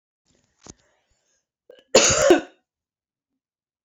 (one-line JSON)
{"cough_length": "3.8 s", "cough_amplitude": 29862, "cough_signal_mean_std_ratio": 0.27, "survey_phase": "beta (2021-08-13 to 2022-03-07)", "age": "45-64", "gender": "Female", "wearing_mask": "No", "symptom_cough_any": true, "symptom_headache": true, "symptom_onset": "8 days", "smoker_status": "Ex-smoker", "respiratory_condition_asthma": false, "respiratory_condition_other": false, "recruitment_source": "Test and Trace", "submission_delay": "2 days", "covid_test_result": "Positive", "covid_test_method": "RT-qPCR", "covid_ct_value": 19.2, "covid_ct_gene": "ORF1ab gene", "covid_ct_mean": 19.6, "covid_viral_load": "370000 copies/ml", "covid_viral_load_category": "Low viral load (10K-1M copies/ml)"}